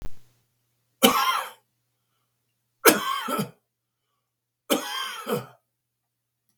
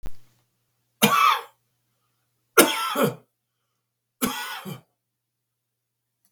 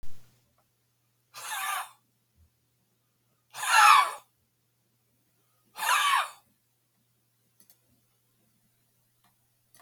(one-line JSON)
{"three_cough_length": "6.6 s", "three_cough_amplitude": 32768, "three_cough_signal_mean_std_ratio": 0.35, "cough_length": "6.3 s", "cough_amplitude": 32768, "cough_signal_mean_std_ratio": 0.33, "exhalation_length": "9.8 s", "exhalation_amplitude": 22044, "exhalation_signal_mean_std_ratio": 0.28, "survey_phase": "beta (2021-08-13 to 2022-03-07)", "age": "65+", "gender": "Male", "wearing_mask": "No", "symptom_none": true, "smoker_status": "Ex-smoker", "respiratory_condition_asthma": false, "respiratory_condition_other": true, "recruitment_source": "REACT", "submission_delay": "4 days", "covid_test_result": "Negative", "covid_test_method": "RT-qPCR", "influenza_a_test_result": "Negative", "influenza_b_test_result": "Negative"}